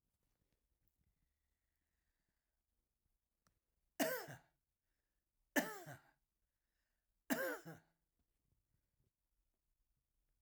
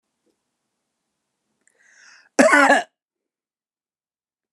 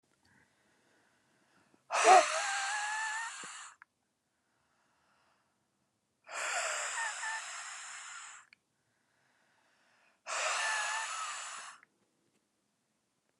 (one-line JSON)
{"three_cough_length": "10.4 s", "three_cough_amplitude": 2366, "three_cough_signal_mean_std_ratio": 0.22, "cough_length": "4.5 s", "cough_amplitude": 32703, "cough_signal_mean_std_ratio": 0.25, "exhalation_length": "13.4 s", "exhalation_amplitude": 10652, "exhalation_signal_mean_std_ratio": 0.37, "survey_phase": "alpha (2021-03-01 to 2021-08-12)", "age": "65+", "gender": "Male", "wearing_mask": "No", "symptom_none": true, "smoker_status": "Never smoked", "respiratory_condition_asthma": false, "respiratory_condition_other": false, "recruitment_source": "REACT", "submission_delay": "2 days", "covid_test_result": "Negative", "covid_test_method": "RT-qPCR"}